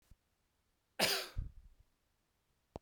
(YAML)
cough_length: 2.8 s
cough_amplitude: 4465
cough_signal_mean_std_ratio: 0.3
survey_phase: beta (2021-08-13 to 2022-03-07)
age: 45-64
gender: Male
wearing_mask: 'No'
symptom_new_continuous_cough: true
smoker_status: Never smoked
respiratory_condition_asthma: false
respiratory_condition_other: false
recruitment_source: Test and Trace
submission_delay: 2 days
covid_test_result: Positive
covid_test_method: RT-qPCR
covid_ct_value: 37.1
covid_ct_gene: N gene